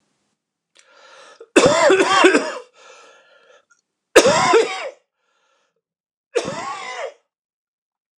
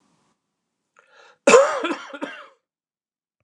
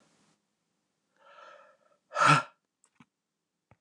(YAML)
three_cough_length: 8.2 s
three_cough_amplitude: 29204
three_cough_signal_mean_std_ratio: 0.39
cough_length: 3.4 s
cough_amplitude: 29203
cough_signal_mean_std_ratio: 0.28
exhalation_length: 3.8 s
exhalation_amplitude: 11972
exhalation_signal_mean_std_ratio: 0.22
survey_phase: beta (2021-08-13 to 2022-03-07)
age: 45-64
gender: Male
wearing_mask: 'No'
symptom_cough_any: true
symptom_runny_or_blocked_nose: true
symptom_shortness_of_breath: true
symptom_fatigue: true
symptom_fever_high_temperature: true
symptom_headache: true
symptom_change_to_sense_of_smell_or_taste: true
symptom_loss_of_taste: true
symptom_onset: 8 days
smoker_status: Never smoked
respiratory_condition_asthma: false
respiratory_condition_other: false
recruitment_source: REACT
submission_delay: 1 day
covid_test_result: Negative
covid_test_method: RT-qPCR
influenza_a_test_result: Negative
influenza_b_test_result: Negative